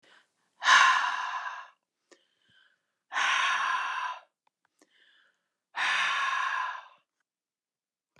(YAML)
exhalation_length: 8.2 s
exhalation_amplitude: 12840
exhalation_signal_mean_std_ratio: 0.46
survey_phase: beta (2021-08-13 to 2022-03-07)
age: 65+
gender: Female
wearing_mask: 'No'
symptom_cough_any: true
symptom_runny_or_blocked_nose: true
symptom_onset: 6 days
smoker_status: Never smoked
respiratory_condition_asthma: false
respiratory_condition_other: false
recruitment_source: REACT
submission_delay: 1 day
covid_test_result: Negative
covid_test_method: RT-qPCR
influenza_a_test_result: Negative
influenza_b_test_result: Negative